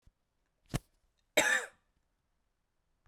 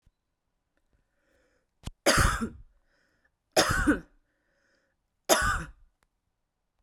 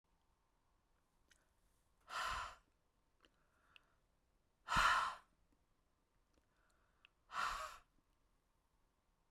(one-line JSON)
{"cough_length": "3.1 s", "cough_amplitude": 7975, "cough_signal_mean_std_ratio": 0.25, "three_cough_length": "6.8 s", "three_cough_amplitude": 20089, "three_cough_signal_mean_std_ratio": 0.32, "exhalation_length": "9.3 s", "exhalation_amplitude": 2964, "exhalation_signal_mean_std_ratio": 0.28, "survey_phase": "beta (2021-08-13 to 2022-03-07)", "age": "18-44", "gender": "Female", "wearing_mask": "No", "symptom_runny_or_blocked_nose": true, "symptom_sore_throat": true, "symptom_fatigue": true, "symptom_fever_high_temperature": true, "symptom_headache": true, "symptom_change_to_sense_of_smell_or_taste": true, "symptom_onset": "4 days", "smoker_status": "Ex-smoker", "respiratory_condition_asthma": false, "respiratory_condition_other": false, "recruitment_source": "Test and Trace", "submission_delay": "2 days", "covid_test_result": "Positive", "covid_test_method": "RT-qPCR", "covid_ct_value": 18.9, "covid_ct_gene": "ORF1ab gene", "covid_ct_mean": 19.4, "covid_viral_load": "450000 copies/ml", "covid_viral_load_category": "Low viral load (10K-1M copies/ml)"}